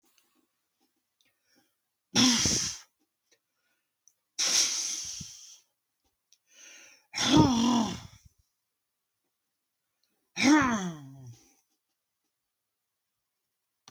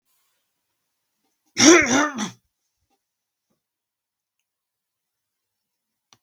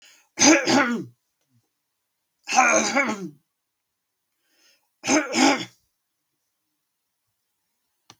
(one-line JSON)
{"exhalation_length": "13.9 s", "exhalation_amplitude": 14474, "exhalation_signal_mean_std_ratio": 0.35, "cough_length": "6.2 s", "cough_amplitude": 32766, "cough_signal_mean_std_ratio": 0.22, "three_cough_length": "8.2 s", "three_cough_amplitude": 27357, "three_cough_signal_mean_std_ratio": 0.36, "survey_phase": "beta (2021-08-13 to 2022-03-07)", "age": "65+", "gender": "Male", "wearing_mask": "No", "symptom_none": true, "smoker_status": "Never smoked", "respiratory_condition_asthma": false, "respiratory_condition_other": false, "recruitment_source": "REACT", "submission_delay": "2 days", "covid_test_result": "Negative", "covid_test_method": "RT-qPCR", "influenza_a_test_result": "Negative", "influenza_b_test_result": "Negative"}